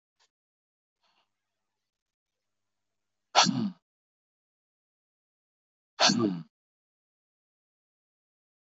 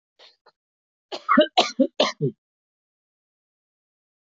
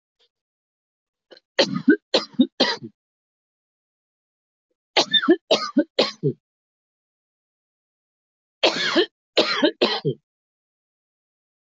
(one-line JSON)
{"exhalation_length": "8.8 s", "exhalation_amplitude": 15032, "exhalation_signal_mean_std_ratio": 0.21, "cough_length": "4.3 s", "cough_amplitude": 19163, "cough_signal_mean_std_ratio": 0.28, "three_cough_length": "11.6 s", "three_cough_amplitude": 19806, "three_cough_signal_mean_std_ratio": 0.33, "survey_phase": "alpha (2021-03-01 to 2021-08-12)", "age": "65+", "gender": "Male", "wearing_mask": "No", "symptom_none": true, "smoker_status": "Ex-smoker", "respiratory_condition_asthma": false, "respiratory_condition_other": true, "recruitment_source": "REACT", "submission_delay": "31 days", "covid_test_result": "Negative", "covid_test_method": "RT-qPCR"}